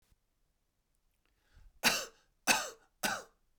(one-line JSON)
{"three_cough_length": "3.6 s", "three_cough_amplitude": 7730, "three_cough_signal_mean_std_ratio": 0.3, "survey_phase": "beta (2021-08-13 to 2022-03-07)", "age": "45-64", "gender": "Male", "wearing_mask": "No", "symptom_none": true, "smoker_status": "Never smoked", "respiratory_condition_asthma": false, "respiratory_condition_other": false, "recruitment_source": "REACT", "submission_delay": "2 days", "covid_test_result": "Negative", "covid_test_method": "RT-qPCR", "influenza_a_test_result": "Negative", "influenza_b_test_result": "Negative"}